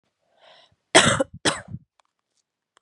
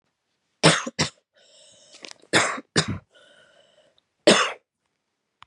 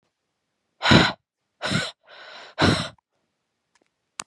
{"cough_length": "2.8 s", "cough_amplitude": 32700, "cough_signal_mean_std_ratio": 0.28, "three_cough_length": "5.5 s", "three_cough_amplitude": 30163, "three_cough_signal_mean_std_ratio": 0.3, "exhalation_length": "4.3 s", "exhalation_amplitude": 29786, "exhalation_signal_mean_std_ratio": 0.32, "survey_phase": "beta (2021-08-13 to 2022-03-07)", "age": "18-44", "gender": "Female", "wearing_mask": "No", "symptom_shortness_of_breath": true, "smoker_status": "Never smoked", "respiratory_condition_asthma": false, "respiratory_condition_other": false, "recruitment_source": "REACT", "submission_delay": "3 days", "covid_test_method": "RT-qPCR", "influenza_a_test_result": "Unknown/Void", "influenza_b_test_result": "Unknown/Void"}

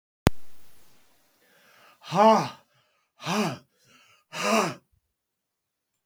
{"exhalation_length": "6.1 s", "exhalation_amplitude": 32768, "exhalation_signal_mean_std_ratio": 0.35, "survey_phase": "beta (2021-08-13 to 2022-03-07)", "age": "65+", "gender": "Male", "wearing_mask": "No", "symptom_none": true, "smoker_status": "Never smoked", "respiratory_condition_asthma": false, "respiratory_condition_other": false, "recruitment_source": "REACT", "submission_delay": "1 day", "covid_test_result": "Negative", "covid_test_method": "RT-qPCR"}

